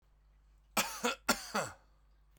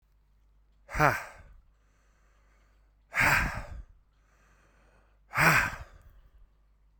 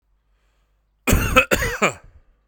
three_cough_length: 2.4 s
three_cough_amplitude: 6539
three_cough_signal_mean_std_ratio: 0.39
exhalation_length: 7.0 s
exhalation_amplitude: 15327
exhalation_signal_mean_std_ratio: 0.33
cough_length: 2.5 s
cough_amplitude: 32768
cough_signal_mean_std_ratio: 0.4
survey_phase: beta (2021-08-13 to 2022-03-07)
age: 18-44
gender: Male
wearing_mask: 'No'
symptom_none: true
smoker_status: Never smoked
respiratory_condition_asthma: true
respiratory_condition_other: false
recruitment_source: REACT
submission_delay: 1 day
covid_test_result: Negative
covid_test_method: RT-qPCR
influenza_a_test_result: Negative
influenza_b_test_result: Negative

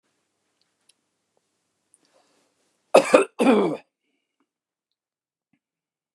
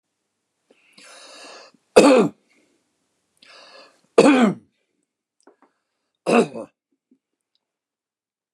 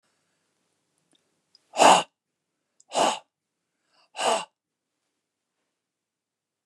cough_length: 6.1 s
cough_amplitude: 29204
cough_signal_mean_std_ratio: 0.23
three_cough_length: 8.5 s
three_cough_amplitude: 29204
three_cough_signal_mean_std_ratio: 0.26
exhalation_length: 6.7 s
exhalation_amplitude: 22669
exhalation_signal_mean_std_ratio: 0.23
survey_phase: beta (2021-08-13 to 2022-03-07)
age: 65+
gender: Male
wearing_mask: 'No'
symptom_none: true
smoker_status: Never smoked
respiratory_condition_asthma: false
respiratory_condition_other: false
recruitment_source: REACT
submission_delay: 1 day
covid_test_result: Negative
covid_test_method: RT-qPCR
influenza_a_test_result: Negative
influenza_b_test_result: Negative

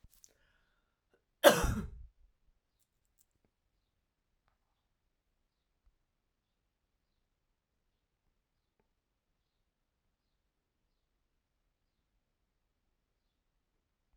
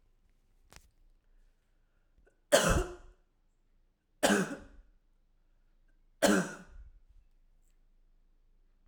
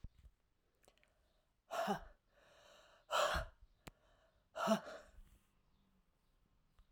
cough_length: 14.2 s
cough_amplitude: 14223
cough_signal_mean_std_ratio: 0.11
three_cough_length: 8.9 s
three_cough_amplitude: 11327
three_cough_signal_mean_std_ratio: 0.27
exhalation_length: 6.9 s
exhalation_amplitude: 3183
exhalation_signal_mean_std_ratio: 0.32
survey_phase: alpha (2021-03-01 to 2021-08-12)
age: 45-64
gender: Female
wearing_mask: 'No'
symptom_none: true
smoker_status: Never smoked
respiratory_condition_asthma: false
respiratory_condition_other: false
recruitment_source: REACT
submission_delay: 2 days
covid_test_result: Negative
covid_test_method: RT-qPCR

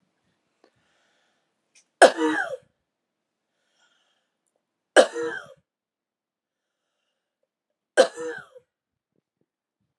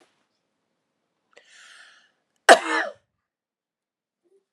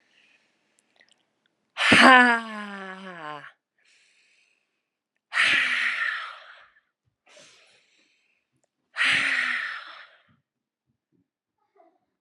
three_cough_length: 10.0 s
three_cough_amplitude: 29778
three_cough_signal_mean_std_ratio: 0.19
cough_length: 4.5 s
cough_amplitude: 32768
cough_signal_mean_std_ratio: 0.16
exhalation_length: 12.2 s
exhalation_amplitude: 32605
exhalation_signal_mean_std_ratio: 0.32
survey_phase: alpha (2021-03-01 to 2021-08-12)
age: 18-44
gender: Female
wearing_mask: 'No'
symptom_shortness_of_breath: true
symptom_fatigue: true
symptom_headache: true
symptom_change_to_sense_of_smell_or_taste: true
symptom_loss_of_taste: true
symptom_onset: 4 days
smoker_status: Ex-smoker
respiratory_condition_asthma: false
respiratory_condition_other: false
recruitment_source: Test and Trace
submission_delay: 1 day
covid_test_result: Positive
covid_test_method: RT-qPCR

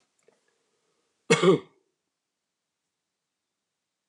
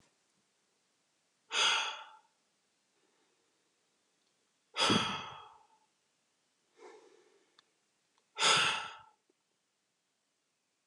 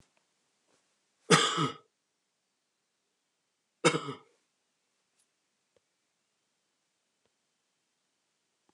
cough_length: 4.1 s
cough_amplitude: 16423
cough_signal_mean_std_ratio: 0.2
exhalation_length: 10.9 s
exhalation_amplitude: 8164
exhalation_signal_mean_std_ratio: 0.29
three_cough_length: 8.7 s
three_cough_amplitude: 14317
three_cough_signal_mean_std_ratio: 0.19
survey_phase: beta (2021-08-13 to 2022-03-07)
age: 65+
gender: Male
wearing_mask: 'No'
symptom_runny_or_blocked_nose: true
smoker_status: Never smoked
respiratory_condition_asthma: true
respiratory_condition_other: true
recruitment_source: REACT
submission_delay: 1 day
covid_test_result: Negative
covid_test_method: RT-qPCR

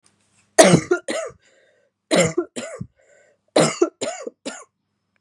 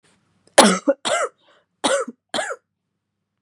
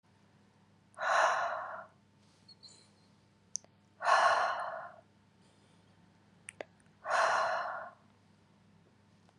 three_cough_length: 5.2 s
three_cough_amplitude: 32768
three_cough_signal_mean_std_ratio: 0.35
cough_length: 3.4 s
cough_amplitude: 32768
cough_signal_mean_std_ratio: 0.35
exhalation_length: 9.4 s
exhalation_amplitude: 6739
exhalation_signal_mean_std_ratio: 0.41
survey_phase: beta (2021-08-13 to 2022-03-07)
age: 18-44
gender: Female
wearing_mask: 'No'
symptom_cough_any: true
symptom_runny_or_blocked_nose: true
symptom_fatigue: true
symptom_fever_high_temperature: true
symptom_headache: true
symptom_other: true
symptom_onset: 5 days
smoker_status: Never smoked
respiratory_condition_asthma: false
respiratory_condition_other: false
recruitment_source: Test and Trace
submission_delay: 1 day
covid_test_result: Positive
covid_test_method: RT-qPCR
covid_ct_value: 13.3
covid_ct_gene: ORF1ab gene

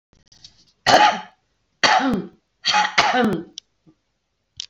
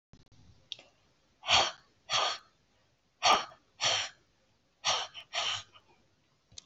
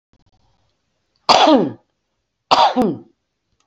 three_cough_length: 4.7 s
three_cough_amplitude: 29712
three_cough_signal_mean_std_ratio: 0.45
exhalation_length: 6.7 s
exhalation_amplitude: 9669
exhalation_signal_mean_std_ratio: 0.37
cough_length: 3.7 s
cough_amplitude: 29915
cough_signal_mean_std_ratio: 0.38
survey_phase: alpha (2021-03-01 to 2021-08-12)
age: 45-64
gender: Female
wearing_mask: 'No'
symptom_none: true
smoker_status: Current smoker (1 to 10 cigarettes per day)
respiratory_condition_asthma: false
respiratory_condition_other: false
recruitment_source: REACT
submission_delay: 3 days
covid_test_result: Negative
covid_test_method: RT-qPCR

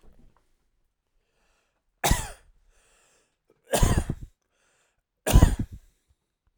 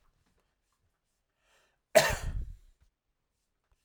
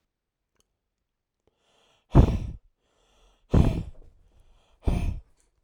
three_cough_length: 6.6 s
three_cough_amplitude: 24144
three_cough_signal_mean_std_ratio: 0.26
cough_length: 3.8 s
cough_amplitude: 14075
cough_signal_mean_std_ratio: 0.22
exhalation_length: 5.6 s
exhalation_amplitude: 23097
exhalation_signal_mean_std_ratio: 0.28
survey_phase: beta (2021-08-13 to 2022-03-07)
age: 18-44
gender: Male
wearing_mask: 'No'
symptom_none: true
smoker_status: Never smoked
respiratory_condition_asthma: false
respiratory_condition_other: false
recruitment_source: Test and Trace
submission_delay: 1 day
covid_test_result: Negative
covid_test_method: LFT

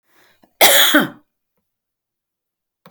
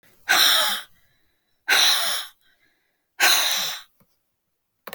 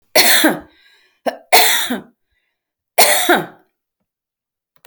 cough_length: 2.9 s
cough_amplitude: 32768
cough_signal_mean_std_ratio: 0.32
exhalation_length: 4.9 s
exhalation_amplitude: 20888
exhalation_signal_mean_std_ratio: 0.47
three_cough_length: 4.9 s
three_cough_amplitude: 32768
three_cough_signal_mean_std_ratio: 0.42
survey_phase: alpha (2021-03-01 to 2021-08-12)
age: 65+
gender: Female
wearing_mask: 'No'
symptom_none: true
smoker_status: Ex-smoker
respiratory_condition_asthma: true
respiratory_condition_other: false
recruitment_source: REACT
submission_delay: 3 days
covid_test_result: Negative
covid_test_method: RT-qPCR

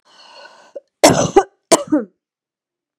cough_length: 3.0 s
cough_amplitude: 32768
cough_signal_mean_std_ratio: 0.32
survey_phase: beta (2021-08-13 to 2022-03-07)
age: 45-64
gender: Female
wearing_mask: 'No'
symptom_cough_any: true
symptom_runny_or_blocked_nose: true
symptom_sore_throat: true
symptom_fatigue: true
symptom_headache: true
smoker_status: Ex-smoker
respiratory_condition_asthma: false
respiratory_condition_other: false
recruitment_source: Test and Trace
submission_delay: 1 day
covid_test_result: Positive
covid_test_method: LFT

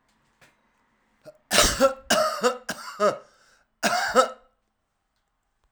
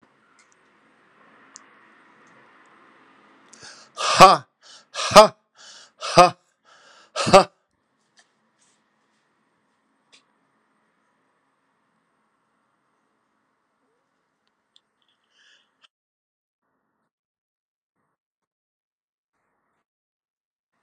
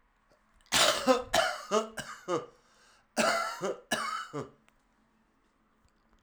three_cough_length: 5.7 s
three_cough_amplitude: 32767
three_cough_signal_mean_std_ratio: 0.4
exhalation_length: 20.8 s
exhalation_amplitude: 32768
exhalation_signal_mean_std_ratio: 0.15
cough_length: 6.2 s
cough_amplitude: 10392
cough_signal_mean_std_ratio: 0.45
survey_phase: alpha (2021-03-01 to 2021-08-12)
age: 45-64
gender: Male
wearing_mask: 'No'
symptom_fever_high_temperature: true
symptom_onset: 2 days
smoker_status: Current smoker (11 or more cigarettes per day)
respiratory_condition_asthma: false
respiratory_condition_other: false
recruitment_source: Test and Trace
submission_delay: 2 days
covid_test_result: Positive
covid_test_method: RT-qPCR
covid_ct_value: 17.3
covid_ct_gene: ORF1ab gene
covid_ct_mean: 18.2
covid_viral_load: 1000000 copies/ml
covid_viral_load_category: High viral load (>1M copies/ml)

